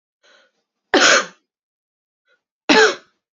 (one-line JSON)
{"cough_length": "3.3 s", "cough_amplitude": 30634, "cough_signal_mean_std_ratio": 0.33, "survey_phase": "beta (2021-08-13 to 2022-03-07)", "age": "18-44", "gender": "Female", "wearing_mask": "No", "symptom_cough_any": true, "symptom_runny_or_blocked_nose": true, "symptom_diarrhoea": true, "symptom_fatigue": true, "symptom_headache": true, "symptom_other": true, "symptom_onset": "2 days", "smoker_status": "Ex-smoker", "respiratory_condition_asthma": false, "respiratory_condition_other": false, "recruitment_source": "Test and Trace", "submission_delay": "1 day", "covid_test_result": "Positive", "covid_test_method": "RT-qPCR", "covid_ct_value": 19.1, "covid_ct_gene": "ORF1ab gene", "covid_ct_mean": 19.5, "covid_viral_load": "410000 copies/ml", "covid_viral_load_category": "Low viral load (10K-1M copies/ml)"}